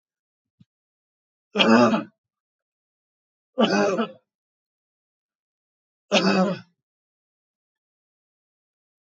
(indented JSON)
{
  "three_cough_length": "9.1 s",
  "three_cough_amplitude": 24716,
  "three_cough_signal_mean_std_ratio": 0.3,
  "survey_phase": "beta (2021-08-13 to 2022-03-07)",
  "age": "65+",
  "gender": "Male",
  "wearing_mask": "No",
  "symptom_none": true,
  "smoker_status": "Never smoked",
  "respiratory_condition_asthma": false,
  "respiratory_condition_other": false,
  "recruitment_source": "REACT",
  "submission_delay": "3 days",
  "covid_test_result": "Negative",
  "covid_test_method": "RT-qPCR",
  "influenza_a_test_result": "Negative",
  "influenza_b_test_result": "Negative"
}